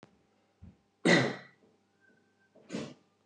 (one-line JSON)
{"cough_length": "3.3 s", "cough_amplitude": 8525, "cough_signal_mean_std_ratio": 0.28, "survey_phase": "beta (2021-08-13 to 2022-03-07)", "age": "45-64", "gender": "Male", "wearing_mask": "No", "symptom_none": true, "smoker_status": "Ex-smoker", "respiratory_condition_asthma": false, "respiratory_condition_other": false, "recruitment_source": "REACT", "submission_delay": "1 day", "covid_test_result": "Negative", "covid_test_method": "RT-qPCR"}